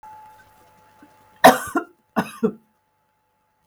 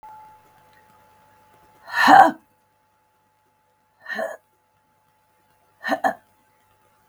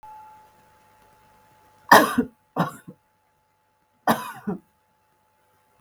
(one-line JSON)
{"cough_length": "3.7 s", "cough_amplitude": 32768, "cough_signal_mean_std_ratio": 0.23, "exhalation_length": "7.1 s", "exhalation_amplitude": 32768, "exhalation_signal_mean_std_ratio": 0.23, "three_cough_length": "5.8 s", "three_cough_amplitude": 32768, "three_cough_signal_mean_std_ratio": 0.23, "survey_phase": "beta (2021-08-13 to 2022-03-07)", "age": "45-64", "gender": "Female", "wearing_mask": "No", "symptom_cough_any": true, "symptom_runny_or_blocked_nose": true, "symptom_shortness_of_breath": true, "symptom_sore_throat": true, "symptom_fatigue": true, "symptom_headache": true, "smoker_status": "Never smoked", "respiratory_condition_asthma": false, "respiratory_condition_other": false, "recruitment_source": "Test and Trace", "submission_delay": "1 day", "covid_test_result": "Positive", "covid_test_method": "RT-qPCR", "covid_ct_value": 26.2, "covid_ct_gene": "N gene"}